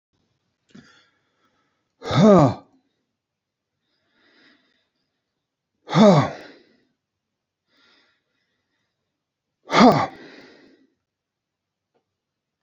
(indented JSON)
{
  "exhalation_length": "12.6 s",
  "exhalation_amplitude": 27994,
  "exhalation_signal_mean_std_ratio": 0.23,
  "survey_phase": "beta (2021-08-13 to 2022-03-07)",
  "age": "65+",
  "gender": "Male",
  "wearing_mask": "No",
  "symptom_none": true,
  "smoker_status": "Never smoked",
  "respiratory_condition_asthma": false,
  "respiratory_condition_other": false,
  "recruitment_source": "REACT",
  "submission_delay": "2 days",
  "covid_test_result": "Negative",
  "covid_test_method": "RT-qPCR",
  "influenza_a_test_result": "Negative",
  "influenza_b_test_result": "Negative"
}